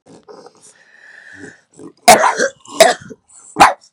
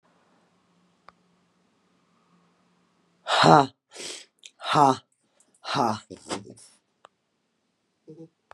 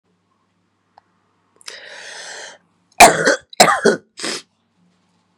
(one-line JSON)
{"cough_length": "3.9 s", "cough_amplitude": 32768, "cough_signal_mean_std_ratio": 0.34, "exhalation_length": "8.5 s", "exhalation_amplitude": 30937, "exhalation_signal_mean_std_ratio": 0.25, "three_cough_length": "5.4 s", "three_cough_amplitude": 32768, "three_cough_signal_mean_std_ratio": 0.28, "survey_phase": "beta (2021-08-13 to 2022-03-07)", "age": "45-64", "gender": "Female", "wearing_mask": "No", "symptom_cough_any": true, "symptom_new_continuous_cough": true, "symptom_runny_or_blocked_nose": true, "symptom_fatigue": true, "symptom_headache": true, "symptom_onset": "2 days", "smoker_status": "Ex-smoker", "respiratory_condition_asthma": true, "respiratory_condition_other": false, "recruitment_source": "Test and Trace", "submission_delay": "1 day", "covid_test_result": "Positive", "covid_test_method": "ePCR"}